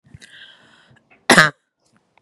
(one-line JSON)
{"cough_length": "2.2 s", "cough_amplitude": 32768, "cough_signal_mean_std_ratio": 0.23, "survey_phase": "beta (2021-08-13 to 2022-03-07)", "age": "18-44", "gender": "Female", "wearing_mask": "No", "symptom_none": true, "smoker_status": "Ex-smoker", "respiratory_condition_asthma": false, "respiratory_condition_other": false, "recruitment_source": "REACT", "submission_delay": "0 days", "covid_test_result": "Negative", "covid_test_method": "RT-qPCR", "influenza_a_test_result": "Unknown/Void", "influenza_b_test_result": "Unknown/Void"}